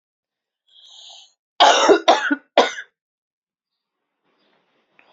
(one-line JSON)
{"cough_length": "5.1 s", "cough_amplitude": 29806, "cough_signal_mean_std_ratio": 0.3, "survey_phase": "alpha (2021-03-01 to 2021-08-12)", "age": "18-44", "gender": "Female", "wearing_mask": "No", "symptom_cough_any": true, "symptom_shortness_of_breath": true, "symptom_fatigue": true, "symptom_fever_high_temperature": true, "symptom_change_to_sense_of_smell_or_taste": true, "symptom_onset": "4 days", "smoker_status": "Ex-smoker", "respiratory_condition_asthma": true, "respiratory_condition_other": false, "recruitment_source": "Test and Trace", "submission_delay": "2 days", "covid_test_result": "Positive", "covid_test_method": "RT-qPCR", "covid_ct_value": 35.6, "covid_ct_gene": "N gene", "covid_ct_mean": 35.6, "covid_viral_load": "2.1 copies/ml", "covid_viral_load_category": "Minimal viral load (< 10K copies/ml)"}